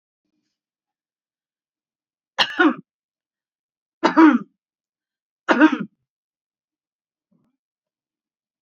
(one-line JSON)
{"three_cough_length": "8.6 s", "three_cough_amplitude": 27151, "three_cough_signal_mean_std_ratio": 0.24, "survey_phase": "beta (2021-08-13 to 2022-03-07)", "age": "65+", "gender": "Female", "wearing_mask": "No", "symptom_none": true, "symptom_onset": "6 days", "smoker_status": "Ex-smoker", "respiratory_condition_asthma": false, "respiratory_condition_other": false, "recruitment_source": "REACT", "submission_delay": "2 days", "covid_test_result": "Negative", "covid_test_method": "RT-qPCR", "influenza_a_test_result": "Negative", "influenza_b_test_result": "Negative"}